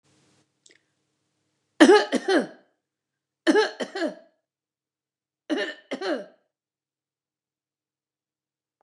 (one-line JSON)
{"three_cough_length": "8.8 s", "three_cough_amplitude": 29005, "three_cough_signal_mean_std_ratio": 0.27, "survey_phase": "beta (2021-08-13 to 2022-03-07)", "age": "45-64", "gender": "Female", "wearing_mask": "No", "symptom_none": true, "smoker_status": "Never smoked", "respiratory_condition_asthma": false, "respiratory_condition_other": false, "recruitment_source": "REACT", "submission_delay": "2 days", "covid_test_result": "Negative", "covid_test_method": "RT-qPCR", "influenza_a_test_result": "Negative", "influenza_b_test_result": "Negative"}